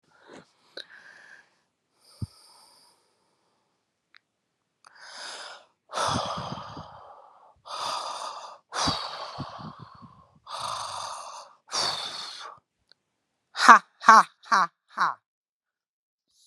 {
  "exhalation_length": "16.5 s",
  "exhalation_amplitude": 32768,
  "exhalation_signal_mean_std_ratio": 0.26,
  "survey_phase": "beta (2021-08-13 to 2022-03-07)",
  "age": "45-64",
  "gender": "Male",
  "wearing_mask": "No",
  "symptom_cough_any": true,
  "symptom_fatigue": true,
  "symptom_fever_high_temperature": true,
  "symptom_headache": true,
  "symptom_change_to_sense_of_smell_or_taste": true,
  "symptom_loss_of_taste": true,
  "symptom_onset": "2 days",
  "smoker_status": "Never smoked",
  "respiratory_condition_asthma": false,
  "respiratory_condition_other": false,
  "recruitment_source": "Test and Trace",
  "submission_delay": "2 days",
  "covid_test_result": "Positive",
  "covid_test_method": "RT-qPCR"
}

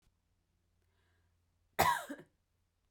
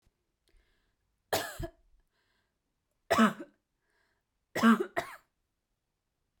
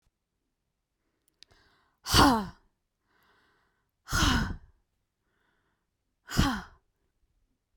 {
  "cough_length": "2.9 s",
  "cough_amplitude": 6625,
  "cough_signal_mean_std_ratio": 0.24,
  "three_cough_length": "6.4 s",
  "three_cough_amplitude": 9478,
  "three_cough_signal_mean_std_ratio": 0.26,
  "exhalation_length": "7.8 s",
  "exhalation_amplitude": 17404,
  "exhalation_signal_mean_std_ratio": 0.28,
  "survey_phase": "beta (2021-08-13 to 2022-03-07)",
  "age": "18-44",
  "gender": "Female",
  "wearing_mask": "No",
  "symptom_none": true,
  "smoker_status": "Never smoked",
  "respiratory_condition_asthma": false,
  "respiratory_condition_other": false,
  "recruitment_source": "REACT",
  "submission_delay": "1 day",
  "covid_test_result": "Negative",
  "covid_test_method": "RT-qPCR"
}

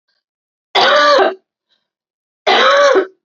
{
  "cough_length": "3.2 s",
  "cough_amplitude": 30761,
  "cough_signal_mean_std_ratio": 0.55,
  "survey_phase": "alpha (2021-03-01 to 2021-08-12)",
  "age": "18-44",
  "gender": "Female",
  "wearing_mask": "No",
  "symptom_fatigue": true,
  "symptom_fever_high_temperature": true,
  "symptom_headache": true,
  "smoker_status": "Never smoked",
  "respiratory_condition_asthma": false,
  "respiratory_condition_other": false,
  "recruitment_source": "Test and Trace",
  "submission_delay": "1 day",
  "covid_test_result": "Positive",
  "covid_test_method": "RT-qPCR",
  "covid_ct_value": 14.4,
  "covid_ct_gene": "ORF1ab gene",
  "covid_ct_mean": 14.6,
  "covid_viral_load": "16000000 copies/ml",
  "covid_viral_load_category": "High viral load (>1M copies/ml)"
}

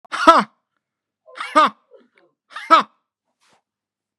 {
  "exhalation_length": "4.2 s",
  "exhalation_amplitude": 32768,
  "exhalation_signal_mean_std_ratio": 0.28,
  "survey_phase": "beta (2021-08-13 to 2022-03-07)",
  "age": "65+",
  "gender": "Male",
  "wearing_mask": "No",
  "symptom_none": true,
  "smoker_status": "Ex-smoker",
  "respiratory_condition_asthma": false,
  "respiratory_condition_other": false,
  "recruitment_source": "REACT",
  "submission_delay": "5 days",
  "covid_test_result": "Negative",
  "covid_test_method": "RT-qPCR"
}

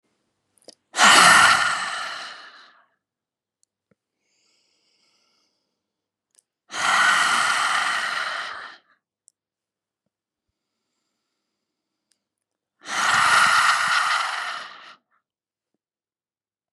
{
  "exhalation_length": "16.7 s",
  "exhalation_amplitude": 31946,
  "exhalation_signal_mean_std_ratio": 0.4,
  "survey_phase": "beta (2021-08-13 to 2022-03-07)",
  "age": "45-64",
  "gender": "Female",
  "wearing_mask": "No",
  "symptom_sore_throat": true,
  "symptom_fatigue": true,
  "symptom_onset": "12 days",
  "smoker_status": "Ex-smoker",
  "respiratory_condition_asthma": true,
  "respiratory_condition_other": false,
  "recruitment_source": "REACT",
  "submission_delay": "1 day",
  "covid_test_result": "Negative",
  "covid_test_method": "RT-qPCR",
  "influenza_a_test_result": "Negative",
  "influenza_b_test_result": "Negative"
}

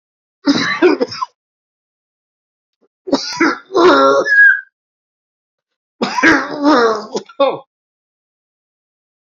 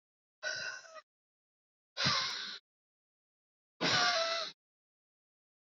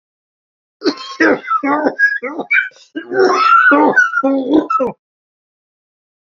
{
  "three_cough_length": "9.3 s",
  "three_cough_amplitude": 31476,
  "three_cough_signal_mean_std_ratio": 0.46,
  "exhalation_length": "5.7 s",
  "exhalation_amplitude": 4974,
  "exhalation_signal_mean_std_ratio": 0.41,
  "cough_length": "6.3 s",
  "cough_amplitude": 31353,
  "cough_signal_mean_std_ratio": 0.62,
  "survey_phase": "beta (2021-08-13 to 2022-03-07)",
  "age": "45-64",
  "gender": "Male",
  "wearing_mask": "No",
  "symptom_cough_any": true,
  "symptom_runny_or_blocked_nose": true,
  "symptom_shortness_of_breath": true,
  "symptom_sore_throat": true,
  "symptom_fatigue": true,
  "symptom_onset": "5 days",
  "smoker_status": "Never smoked",
  "respiratory_condition_asthma": false,
  "respiratory_condition_other": false,
  "recruitment_source": "Test and Trace",
  "submission_delay": "-1 day",
  "covid_test_result": "Positive",
  "covid_test_method": "RT-qPCR",
  "covid_ct_value": 17.8,
  "covid_ct_gene": "N gene"
}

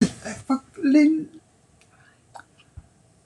{
  "three_cough_length": "3.3 s",
  "three_cough_amplitude": 15569,
  "three_cough_signal_mean_std_ratio": 0.4,
  "survey_phase": "beta (2021-08-13 to 2022-03-07)",
  "age": "65+",
  "gender": "Female",
  "wearing_mask": "No",
  "symptom_none": true,
  "smoker_status": "Ex-smoker",
  "respiratory_condition_asthma": false,
  "respiratory_condition_other": false,
  "recruitment_source": "REACT",
  "submission_delay": "3 days",
  "covid_test_result": "Negative",
  "covid_test_method": "RT-qPCR"
}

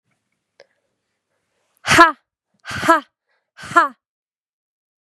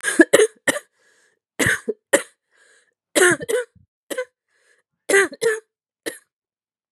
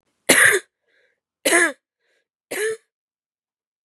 {
  "exhalation_length": "5.0 s",
  "exhalation_amplitude": 32768,
  "exhalation_signal_mean_std_ratio": 0.25,
  "cough_length": "6.9 s",
  "cough_amplitude": 32768,
  "cough_signal_mean_std_ratio": 0.34,
  "three_cough_length": "3.8 s",
  "three_cough_amplitude": 32767,
  "three_cough_signal_mean_std_ratio": 0.34,
  "survey_phase": "beta (2021-08-13 to 2022-03-07)",
  "age": "18-44",
  "gender": "Female",
  "wearing_mask": "No",
  "symptom_cough_any": true,
  "symptom_new_continuous_cough": true,
  "symptom_runny_or_blocked_nose": true,
  "symptom_sore_throat": true,
  "symptom_fever_high_temperature": true,
  "symptom_headache": true,
  "symptom_change_to_sense_of_smell_or_taste": true,
  "symptom_onset": "9 days",
  "smoker_status": "Never smoked",
  "respiratory_condition_asthma": false,
  "respiratory_condition_other": false,
  "recruitment_source": "Test and Trace",
  "submission_delay": "2 days",
  "covid_test_result": "Negative",
  "covid_test_method": "RT-qPCR"
}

